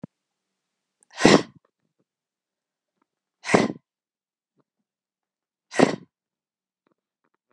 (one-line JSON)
{"exhalation_length": "7.5 s", "exhalation_amplitude": 32768, "exhalation_signal_mean_std_ratio": 0.19, "survey_phase": "beta (2021-08-13 to 2022-03-07)", "age": "45-64", "gender": "Female", "wearing_mask": "No", "symptom_cough_any": true, "symptom_fever_high_temperature": true, "symptom_change_to_sense_of_smell_or_taste": true, "symptom_onset": "6 days", "smoker_status": "Never smoked", "respiratory_condition_asthma": false, "respiratory_condition_other": false, "recruitment_source": "Test and Trace", "submission_delay": "2 days", "covid_test_result": "Positive", "covid_test_method": "RT-qPCR"}